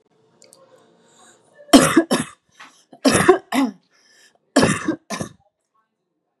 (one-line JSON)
{"three_cough_length": "6.4 s", "three_cough_amplitude": 32768, "three_cough_signal_mean_std_ratio": 0.34, "survey_phase": "beta (2021-08-13 to 2022-03-07)", "age": "18-44", "gender": "Female", "wearing_mask": "No", "symptom_none": true, "smoker_status": "Never smoked", "respiratory_condition_asthma": false, "respiratory_condition_other": false, "recruitment_source": "REACT", "submission_delay": "1 day", "covid_test_result": "Negative", "covid_test_method": "RT-qPCR", "influenza_a_test_result": "Unknown/Void", "influenza_b_test_result": "Unknown/Void"}